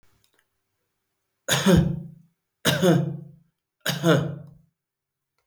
{"three_cough_length": "5.5 s", "three_cough_amplitude": 16414, "three_cough_signal_mean_std_ratio": 0.41, "survey_phase": "beta (2021-08-13 to 2022-03-07)", "age": "65+", "gender": "Male", "wearing_mask": "No", "symptom_none": true, "smoker_status": "Ex-smoker", "respiratory_condition_asthma": false, "respiratory_condition_other": false, "recruitment_source": "REACT", "submission_delay": "3 days", "covid_test_result": "Negative", "covid_test_method": "RT-qPCR", "influenza_a_test_result": "Negative", "influenza_b_test_result": "Negative"}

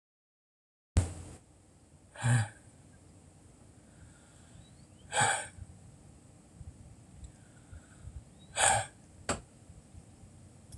{"exhalation_length": "10.8 s", "exhalation_amplitude": 11245, "exhalation_signal_mean_std_ratio": 0.34, "survey_phase": "alpha (2021-03-01 to 2021-08-12)", "age": "45-64", "gender": "Female", "wearing_mask": "No", "symptom_cough_any": true, "symptom_headache": true, "smoker_status": "Never smoked", "respiratory_condition_asthma": true, "respiratory_condition_other": false, "recruitment_source": "REACT", "submission_delay": "1 day", "covid_test_result": "Negative", "covid_test_method": "RT-qPCR"}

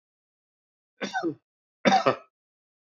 {"cough_length": "2.9 s", "cough_amplitude": 16705, "cough_signal_mean_std_ratio": 0.3, "survey_phase": "beta (2021-08-13 to 2022-03-07)", "age": "65+", "gender": "Male", "wearing_mask": "No", "symptom_none": true, "smoker_status": "Ex-smoker", "respiratory_condition_asthma": false, "respiratory_condition_other": false, "recruitment_source": "REACT", "submission_delay": "2 days", "covid_test_result": "Negative", "covid_test_method": "RT-qPCR", "influenza_a_test_result": "Negative", "influenza_b_test_result": "Negative"}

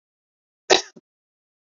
{"cough_length": "1.6 s", "cough_amplitude": 27820, "cough_signal_mean_std_ratio": 0.17, "survey_phase": "beta (2021-08-13 to 2022-03-07)", "age": "45-64", "gender": "Female", "wearing_mask": "No", "symptom_runny_or_blocked_nose": true, "symptom_shortness_of_breath": true, "symptom_sore_throat": true, "symptom_fatigue": true, "symptom_headache": true, "symptom_onset": "3 days", "smoker_status": "Ex-smoker", "respiratory_condition_asthma": false, "respiratory_condition_other": false, "recruitment_source": "Test and Trace", "submission_delay": "2 days", "covid_test_result": "Positive", "covid_test_method": "RT-qPCR", "covid_ct_value": 31.8, "covid_ct_gene": "ORF1ab gene", "covid_ct_mean": 31.9, "covid_viral_load": "35 copies/ml", "covid_viral_load_category": "Minimal viral load (< 10K copies/ml)"}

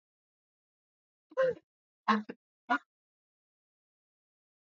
{"three_cough_length": "4.8 s", "three_cough_amplitude": 7293, "three_cough_signal_mean_std_ratio": 0.23, "survey_phase": "beta (2021-08-13 to 2022-03-07)", "age": "18-44", "gender": "Female", "wearing_mask": "No", "symptom_sore_throat": true, "symptom_fatigue": true, "symptom_headache": true, "symptom_onset": "5 days", "smoker_status": "Never smoked", "respiratory_condition_asthma": false, "respiratory_condition_other": false, "recruitment_source": "REACT", "submission_delay": "2 days", "covid_test_result": "Negative", "covid_test_method": "RT-qPCR", "influenza_a_test_result": "Negative", "influenza_b_test_result": "Negative"}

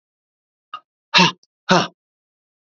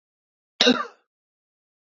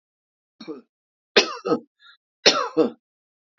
{"exhalation_length": "2.7 s", "exhalation_amplitude": 32768, "exhalation_signal_mean_std_ratio": 0.27, "cough_length": "2.0 s", "cough_amplitude": 27844, "cough_signal_mean_std_ratio": 0.24, "three_cough_length": "3.6 s", "three_cough_amplitude": 31107, "three_cough_signal_mean_std_ratio": 0.3, "survey_phase": "beta (2021-08-13 to 2022-03-07)", "age": "45-64", "gender": "Male", "wearing_mask": "No", "symptom_cough_any": true, "symptom_runny_or_blocked_nose": true, "symptom_shortness_of_breath": true, "symptom_fatigue": true, "symptom_headache": true, "symptom_onset": "4 days", "smoker_status": "Never smoked", "respiratory_condition_asthma": false, "respiratory_condition_other": false, "recruitment_source": "Test and Trace", "submission_delay": "2 days", "covid_test_result": "Positive", "covid_test_method": "RT-qPCR", "covid_ct_value": 19.3, "covid_ct_gene": "ORF1ab gene", "covid_ct_mean": 20.3, "covid_viral_load": "220000 copies/ml", "covid_viral_load_category": "Low viral load (10K-1M copies/ml)"}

